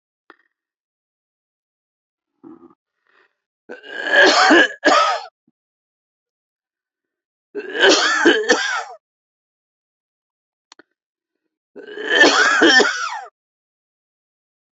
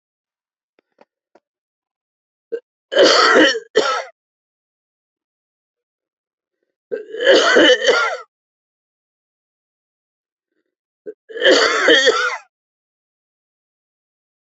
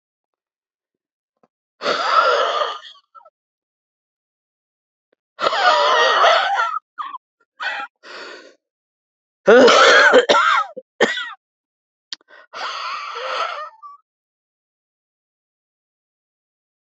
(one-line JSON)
{"cough_length": "14.8 s", "cough_amplitude": 30198, "cough_signal_mean_std_ratio": 0.37, "three_cough_length": "14.4 s", "three_cough_amplitude": 32492, "three_cough_signal_mean_std_ratio": 0.36, "exhalation_length": "16.9 s", "exhalation_amplitude": 30359, "exhalation_signal_mean_std_ratio": 0.4, "survey_phase": "beta (2021-08-13 to 2022-03-07)", "age": "65+", "gender": "Male", "wearing_mask": "No", "symptom_cough_any": true, "symptom_shortness_of_breath": true, "symptom_abdominal_pain": true, "symptom_onset": "12 days", "smoker_status": "Ex-smoker", "respiratory_condition_asthma": false, "respiratory_condition_other": false, "recruitment_source": "REACT", "submission_delay": "1 day", "covid_test_result": "Negative", "covid_test_method": "RT-qPCR", "influenza_a_test_result": "Negative", "influenza_b_test_result": "Negative"}